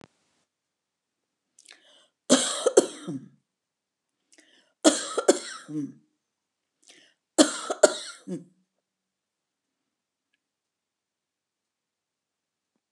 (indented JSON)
{
  "three_cough_length": "12.9 s",
  "three_cough_amplitude": 26727,
  "three_cough_signal_mean_std_ratio": 0.22,
  "survey_phase": "beta (2021-08-13 to 2022-03-07)",
  "age": "65+",
  "gender": "Female",
  "wearing_mask": "No",
  "symptom_none": true,
  "smoker_status": "Never smoked",
  "respiratory_condition_asthma": false,
  "respiratory_condition_other": false,
  "recruitment_source": "REACT",
  "submission_delay": "13 days",
  "covid_test_result": "Negative",
  "covid_test_method": "RT-qPCR"
}